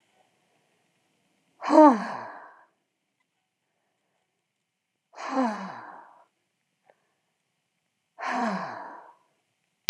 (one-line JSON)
{"exhalation_length": "9.9 s", "exhalation_amplitude": 32768, "exhalation_signal_mean_std_ratio": 0.23, "survey_phase": "beta (2021-08-13 to 2022-03-07)", "age": "65+", "gender": "Female", "wearing_mask": "No", "symptom_cough_any": true, "smoker_status": "Never smoked", "respiratory_condition_asthma": false, "respiratory_condition_other": false, "recruitment_source": "REACT", "submission_delay": "2 days", "covid_test_result": "Negative", "covid_test_method": "RT-qPCR"}